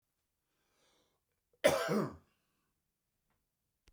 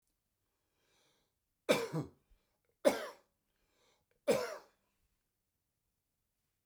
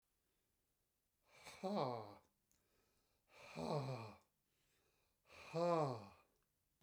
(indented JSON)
{
  "cough_length": "3.9 s",
  "cough_amplitude": 7446,
  "cough_signal_mean_std_ratio": 0.25,
  "three_cough_length": "6.7 s",
  "three_cough_amplitude": 6991,
  "three_cough_signal_mean_std_ratio": 0.24,
  "exhalation_length": "6.8 s",
  "exhalation_amplitude": 1417,
  "exhalation_signal_mean_std_ratio": 0.38,
  "survey_phase": "beta (2021-08-13 to 2022-03-07)",
  "age": "65+",
  "gender": "Male",
  "wearing_mask": "No",
  "symptom_none": true,
  "smoker_status": "Ex-smoker",
  "respiratory_condition_asthma": false,
  "respiratory_condition_other": false,
  "recruitment_source": "REACT",
  "submission_delay": "13 days",
  "covid_test_result": "Negative",
  "covid_test_method": "RT-qPCR"
}